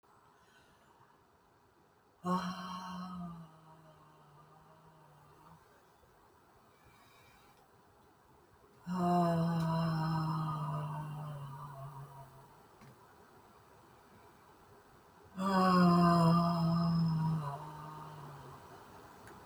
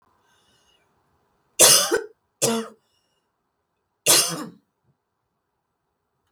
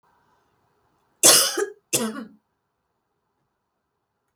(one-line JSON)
{"exhalation_length": "19.5 s", "exhalation_amplitude": 5182, "exhalation_signal_mean_std_ratio": 0.48, "three_cough_length": "6.3 s", "three_cough_amplitude": 32768, "three_cough_signal_mean_std_ratio": 0.28, "cough_length": "4.4 s", "cough_amplitude": 32767, "cough_signal_mean_std_ratio": 0.26, "survey_phase": "beta (2021-08-13 to 2022-03-07)", "age": "65+", "gender": "Female", "wearing_mask": "No", "symptom_none": true, "smoker_status": "Ex-smoker", "respiratory_condition_asthma": false, "respiratory_condition_other": false, "recruitment_source": "REACT", "submission_delay": "3 days", "covid_test_result": "Negative", "covid_test_method": "RT-qPCR", "influenza_a_test_result": "Negative", "influenza_b_test_result": "Negative"}